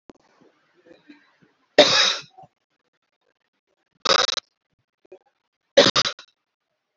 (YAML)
three_cough_length: 7.0 s
three_cough_amplitude: 29869
three_cough_signal_mean_std_ratio: 0.26
survey_phase: beta (2021-08-13 to 2022-03-07)
age: 45-64
gender: Female
wearing_mask: 'No'
symptom_none: true
smoker_status: Ex-smoker
respiratory_condition_asthma: false
respiratory_condition_other: false
recruitment_source: REACT
submission_delay: 12 days
covid_test_result: Negative
covid_test_method: RT-qPCR
influenza_a_test_result: Negative
influenza_b_test_result: Negative